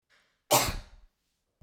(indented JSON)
{
  "cough_length": "1.6 s",
  "cough_amplitude": 12313,
  "cough_signal_mean_std_ratio": 0.31,
  "survey_phase": "beta (2021-08-13 to 2022-03-07)",
  "age": "45-64",
  "gender": "Female",
  "wearing_mask": "No",
  "symptom_none": true,
  "smoker_status": "Never smoked",
  "respiratory_condition_asthma": false,
  "respiratory_condition_other": false,
  "recruitment_source": "REACT",
  "submission_delay": "3 days",
  "covid_test_result": "Negative",
  "covid_test_method": "RT-qPCR",
  "influenza_a_test_result": "Unknown/Void",
  "influenza_b_test_result": "Unknown/Void"
}